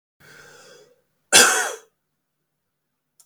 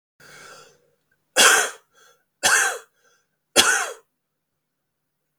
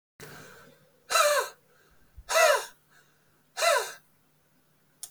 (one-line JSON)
{"cough_length": "3.3 s", "cough_amplitude": 32768, "cough_signal_mean_std_ratio": 0.26, "three_cough_length": "5.4 s", "three_cough_amplitude": 31924, "three_cough_signal_mean_std_ratio": 0.33, "exhalation_length": "5.1 s", "exhalation_amplitude": 11222, "exhalation_signal_mean_std_ratio": 0.38, "survey_phase": "beta (2021-08-13 to 2022-03-07)", "age": "18-44", "gender": "Male", "wearing_mask": "No", "symptom_cough_any": true, "symptom_onset": "12 days", "smoker_status": "Never smoked", "respiratory_condition_asthma": true, "respiratory_condition_other": false, "recruitment_source": "REACT", "submission_delay": "2 days", "covid_test_result": "Positive", "covid_test_method": "RT-qPCR", "covid_ct_value": 32.0, "covid_ct_gene": "N gene", "influenza_a_test_result": "Negative", "influenza_b_test_result": "Negative"}